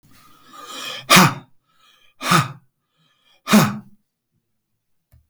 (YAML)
exhalation_length: 5.3 s
exhalation_amplitude: 32768
exhalation_signal_mean_std_ratio: 0.31
survey_phase: alpha (2021-03-01 to 2021-08-12)
age: 65+
gender: Male
wearing_mask: 'No'
symptom_none: true
smoker_status: Ex-smoker
respiratory_condition_asthma: false
respiratory_condition_other: false
recruitment_source: REACT
submission_delay: 2 days
covid_test_result: Negative
covid_test_method: RT-qPCR